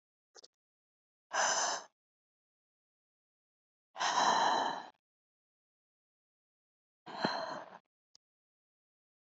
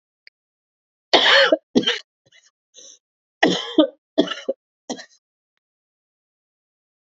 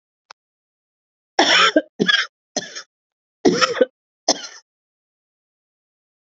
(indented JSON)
{
  "exhalation_length": "9.4 s",
  "exhalation_amplitude": 4669,
  "exhalation_signal_mean_std_ratio": 0.34,
  "three_cough_length": "7.1 s",
  "three_cough_amplitude": 29426,
  "three_cough_signal_mean_std_ratio": 0.3,
  "cough_length": "6.2 s",
  "cough_amplitude": 28958,
  "cough_signal_mean_std_ratio": 0.32,
  "survey_phase": "alpha (2021-03-01 to 2021-08-12)",
  "age": "45-64",
  "gender": "Female",
  "wearing_mask": "No",
  "symptom_cough_any": true,
  "symptom_shortness_of_breath": true,
  "symptom_abdominal_pain": true,
  "symptom_fatigue": true,
  "symptom_headache": true,
  "symptom_loss_of_taste": true,
  "symptom_onset": "3 days",
  "smoker_status": "Never smoked",
  "respiratory_condition_asthma": false,
  "respiratory_condition_other": true,
  "recruitment_source": "Test and Trace",
  "submission_delay": "2 days",
  "covid_test_result": "Positive",
  "covid_test_method": "RT-qPCR"
}